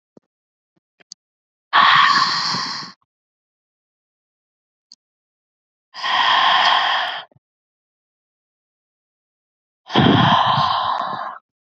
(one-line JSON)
{"exhalation_length": "11.8 s", "exhalation_amplitude": 29117, "exhalation_signal_mean_std_ratio": 0.44, "survey_phase": "beta (2021-08-13 to 2022-03-07)", "age": "18-44", "gender": "Female", "wearing_mask": "No", "symptom_none": true, "symptom_onset": "9 days", "smoker_status": "Ex-smoker", "respiratory_condition_asthma": true, "respiratory_condition_other": false, "recruitment_source": "REACT", "submission_delay": "1 day", "covid_test_result": "Negative", "covid_test_method": "RT-qPCR", "influenza_a_test_result": "Negative", "influenza_b_test_result": "Negative"}